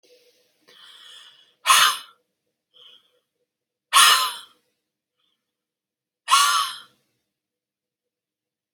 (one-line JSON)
{"exhalation_length": "8.7 s", "exhalation_amplitude": 30854, "exhalation_signal_mean_std_ratio": 0.28, "survey_phase": "alpha (2021-03-01 to 2021-08-12)", "age": "45-64", "gender": "Female", "wearing_mask": "No", "symptom_none": true, "smoker_status": "Never smoked", "respiratory_condition_asthma": false, "respiratory_condition_other": false, "recruitment_source": "REACT", "submission_delay": "2 days", "covid_test_result": "Negative", "covid_test_method": "RT-qPCR"}